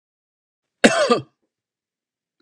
{
  "cough_length": "2.4 s",
  "cough_amplitude": 32768,
  "cough_signal_mean_std_ratio": 0.27,
  "survey_phase": "beta (2021-08-13 to 2022-03-07)",
  "age": "45-64",
  "gender": "Male",
  "wearing_mask": "No",
  "symptom_none": true,
  "smoker_status": "Never smoked",
  "respiratory_condition_asthma": false,
  "respiratory_condition_other": false,
  "recruitment_source": "REACT",
  "submission_delay": "2 days",
  "covid_test_result": "Negative",
  "covid_test_method": "RT-qPCR"
}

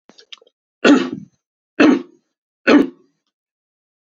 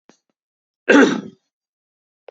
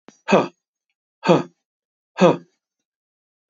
{
  "three_cough_length": "4.0 s",
  "three_cough_amplitude": 29098,
  "three_cough_signal_mean_std_ratio": 0.33,
  "cough_length": "2.3 s",
  "cough_amplitude": 29651,
  "cough_signal_mean_std_ratio": 0.28,
  "exhalation_length": "3.5 s",
  "exhalation_amplitude": 27687,
  "exhalation_signal_mean_std_ratio": 0.28,
  "survey_phase": "beta (2021-08-13 to 2022-03-07)",
  "age": "45-64",
  "gender": "Male",
  "wearing_mask": "No",
  "symptom_none": true,
  "smoker_status": "Ex-smoker",
  "respiratory_condition_asthma": false,
  "respiratory_condition_other": false,
  "recruitment_source": "REACT",
  "submission_delay": "2 days",
  "covid_test_result": "Negative",
  "covid_test_method": "RT-qPCR",
  "influenza_a_test_result": "Negative",
  "influenza_b_test_result": "Negative"
}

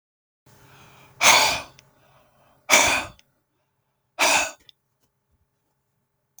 {
  "exhalation_length": "6.4 s",
  "exhalation_amplitude": 32544,
  "exhalation_signal_mean_std_ratio": 0.31,
  "survey_phase": "beta (2021-08-13 to 2022-03-07)",
  "age": "45-64",
  "gender": "Male",
  "wearing_mask": "No",
  "symptom_none": true,
  "smoker_status": "Never smoked",
  "respiratory_condition_asthma": false,
  "respiratory_condition_other": false,
  "recruitment_source": "REACT",
  "submission_delay": "2 days",
  "covid_test_result": "Negative",
  "covid_test_method": "RT-qPCR",
  "influenza_a_test_result": "Negative",
  "influenza_b_test_result": "Negative"
}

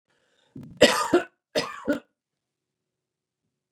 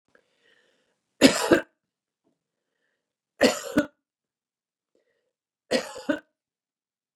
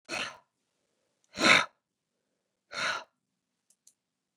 {
  "cough_length": "3.7 s",
  "cough_amplitude": 27591,
  "cough_signal_mean_std_ratio": 0.28,
  "three_cough_length": "7.2 s",
  "three_cough_amplitude": 29651,
  "three_cough_signal_mean_std_ratio": 0.23,
  "exhalation_length": "4.4 s",
  "exhalation_amplitude": 16058,
  "exhalation_signal_mean_std_ratio": 0.25,
  "survey_phase": "beta (2021-08-13 to 2022-03-07)",
  "age": "65+",
  "gender": "Female",
  "wearing_mask": "No",
  "symptom_none": true,
  "smoker_status": "Ex-smoker",
  "respiratory_condition_asthma": false,
  "respiratory_condition_other": false,
  "recruitment_source": "REACT",
  "submission_delay": "6 days",
  "covid_test_result": "Negative",
  "covid_test_method": "RT-qPCR",
  "influenza_a_test_result": "Negative",
  "influenza_b_test_result": "Negative"
}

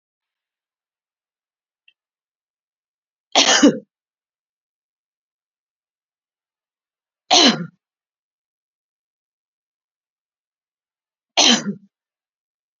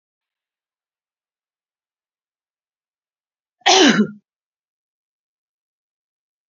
{
  "three_cough_length": "12.8 s",
  "three_cough_amplitude": 32768,
  "three_cough_signal_mean_std_ratio": 0.21,
  "cough_length": "6.5 s",
  "cough_amplitude": 32767,
  "cough_signal_mean_std_ratio": 0.2,
  "survey_phase": "beta (2021-08-13 to 2022-03-07)",
  "age": "45-64",
  "gender": "Female",
  "wearing_mask": "No",
  "symptom_none": true,
  "smoker_status": "Ex-smoker",
  "respiratory_condition_asthma": false,
  "respiratory_condition_other": false,
  "recruitment_source": "REACT",
  "submission_delay": "1 day",
  "covid_test_result": "Negative",
  "covid_test_method": "RT-qPCR"
}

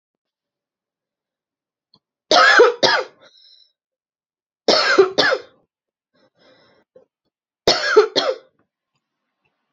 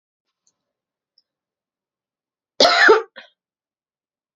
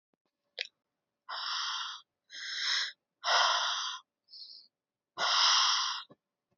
{
  "three_cough_length": "9.7 s",
  "three_cough_amplitude": 32768,
  "three_cough_signal_mean_std_ratio": 0.33,
  "cough_length": "4.4 s",
  "cough_amplitude": 29101,
  "cough_signal_mean_std_ratio": 0.24,
  "exhalation_length": "6.6 s",
  "exhalation_amplitude": 6857,
  "exhalation_signal_mean_std_ratio": 0.52,
  "survey_phase": "beta (2021-08-13 to 2022-03-07)",
  "age": "18-44",
  "gender": "Female",
  "wearing_mask": "No",
  "symptom_cough_any": true,
  "symptom_runny_or_blocked_nose": true,
  "symptom_sore_throat": true,
  "symptom_fatigue": true,
  "symptom_headache": true,
  "smoker_status": "Never smoked",
  "respiratory_condition_asthma": false,
  "respiratory_condition_other": false,
  "recruitment_source": "Test and Trace",
  "submission_delay": "1 day",
  "covid_test_result": "Positive",
  "covid_test_method": "RT-qPCR",
  "covid_ct_value": 24.1,
  "covid_ct_gene": "ORF1ab gene",
  "covid_ct_mean": 24.6,
  "covid_viral_load": "8700 copies/ml",
  "covid_viral_load_category": "Minimal viral load (< 10K copies/ml)"
}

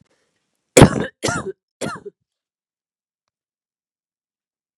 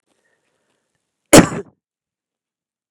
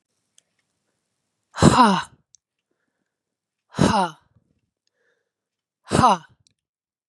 {
  "three_cough_length": "4.8 s",
  "three_cough_amplitude": 32768,
  "three_cough_signal_mean_std_ratio": 0.2,
  "cough_length": "2.9 s",
  "cough_amplitude": 32768,
  "cough_signal_mean_std_ratio": 0.18,
  "exhalation_length": "7.1 s",
  "exhalation_amplitude": 32477,
  "exhalation_signal_mean_std_ratio": 0.27,
  "survey_phase": "beta (2021-08-13 to 2022-03-07)",
  "age": "18-44",
  "gender": "Female",
  "wearing_mask": "No",
  "symptom_runny_or_blocked_nose": true,
  "symptom_fatigue": true,
  "symptom_headache": true,
  "symptom_change_to_sense_of_smell_or_taste": true,
  "symptom_other": true,
  "symptom_onset": "3 days",
  "smoker_status": "Never smoked",
  "respiratory_condition_asthma": false,
  "respiratory_condition_other": false,
  "recruitment_source": "Test and Trace",
  "submission_delay": "1 day",
  "covid_test_result": "Positive",
  "covid_test_method": "RT-qPCR",
  "covid_ct_value": 34.1,
  "covid_ct_gene": "S gene",
  "covid_ct_mean": 34.3,
  "covid_viral_load": "5.8 copies/ml",
  "covid_viral_load_category": "Minimal viral load (< 10K copies/ml)"
}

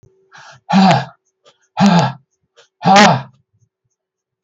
{
  "exhalation_length": "4.4 s",
  "exhalation_amplitude": 32768,
  "exhalation_signal_mean_std_ratio": 0.42,
  "survey_phase": "beta (2021-08-13 to 2022-03-07)",
  "age": "65+",
  "gender": "Male",
  "wearing_mask": "No",
  "symptom_none": true,
  "smoker_status": "Never smoked",
  "respiratory_condition_asthma": false,
  "respiratory_condition_other": false,
  "recruitment_source": "REACT",
  "submission_delay": "4 days",
  "covid_test_result": "Negative",
  "covid_test_method": "RT-qPCR"
}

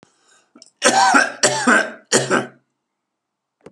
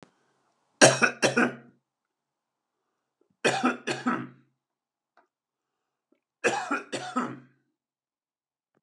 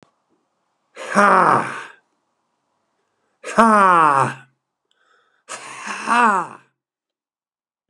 {
  "cough_length": "3.7 s",
  "cough_amplitude": 32498,
  "cough_signal_mean_std_ratio": 0.46,
  "three_cough_length": "8.8 s",
  "three_cough_amplitude": 26689,
  "three_cough_signal_mean_std_ratio": 0.3,
  "exhalation_length": "7.9 s",
  "exhalation_amplitude": 32767,
  "exhalation_signal_mean_std_ratio": 0.37,
  "survey_phase": "beta (2021-08-13 to 2022-03-07)",
  "age": "65+",
  "gender": "Male",
  "wearing_mask": "No",
  "symptom_none": true,
  "smoker_status": "Ex-smoker",
  "respiratory_condition_asthma": false,
  "respiratory_condition_other": true,
  "recruitment_source": "REACT",
  "submission_delay": "2 days",
  "covid_test_result": "Negative",
  "covid_test_method": "RT-qPCR"
}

